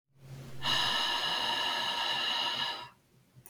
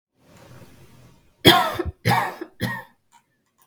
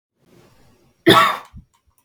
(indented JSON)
{
  "exhalation_length": "3.5 s",
  "exhalation_amplitude": 4452,
  "exhalation_signal_mean_std_ratio": 0.87,
  "three_cough_length": "3.7 s",
  "three_cough_amplitude": 32768,
  "three_cough_signal_mean_std_ratio": 0.34,
  "cough_length": "2.0 s",
  "cough_amplitude": 32768,
  "cough_signal_mean_std_ratio": 0.31,
  "survey_phase": "beta (2021-08-13 to 2022-03-07)",
  "age": "18-44",
  "gender": "Female",
  "wearing_mask": "No",
  "symptom_none": true,
  "smoker_status": "Never smoked",
  "respiratory_condition_asthma": false,
  "respiratory_condition_other": false,
  "recruitment_source": "REACT",
  "submission_delay": "1 day",
  "covid_test_result": "Negative",
  "covid_test_method": "RT-qPCR",
  "influenza_a_test_result": "Negative",
  "influenza_b_test_result": "Negative"
}